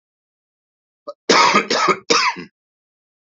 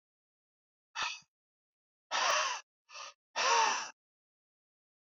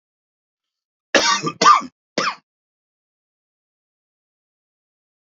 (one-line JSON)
{"three_cough_length": "3.3 s", "three_cough_amplitude": 29544, "three_cough_signal_mean_std_ratio": 0.42, "exhalation_length": "5.1 s", "exhalation_amplitude": 4904, "exhalation_signal_mean_std_ratio": 0.39, "cough_length": "5.2 s", "cough_amplitude": 32767, "cough_signal_mean_std_ratio": 0.26, "survey_phase": "beta (2021-08-13 to 2022-03-07)", "age": "65+", "gender": "Male", "wearing_mask": "No", "symptom_cough_any": true, "symptom_runny_or_blocked_nose": true, "symptom_fatigue": true, "smoker_status": "Never smoked", "respiratory_condition_asthma": false, "respiratory_condition_other": false, "recruitment_source": "Test and Trace", "submission_delay": "0 days", "covid_test_result": "Positive", "covid_test_method": "LFT"}